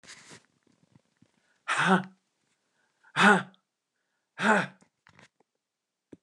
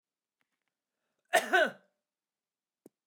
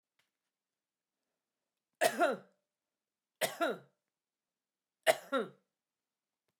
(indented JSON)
{
  "exhalation_length": "6.2 s",
  "exhalation_amplitude": 17925,
  "exhalation_signal_mean_std_ratio": 0.28,
  "cough_length": "3.1 s",
  "cough_amplitude": 9249,
  "cough_signal_mean_std_ratio": 0.24,
  "three_cough_length": "6.6 s",
  "three_cough_amplitude": 8495,
  "three_cough_signal_mean_std_ratio": 0.26,
  "survey_phase": "beta (2021-08-13 to 2022-03-07)",
  "age": "65+",
  "gender": "Female",
  "wearing_mask": "No",
  "symptom_none": true,
  "smoker_status": "Ex-smoker",
  "respiratory_condition_asthma": false,
  "respiratory_condition_other": false,
  "recruitment_source": "REACT",
  "submission_delay": "1 day",
  "covid_test_result": "Negative",
  "covid_test_method": "RT-qPCR"
}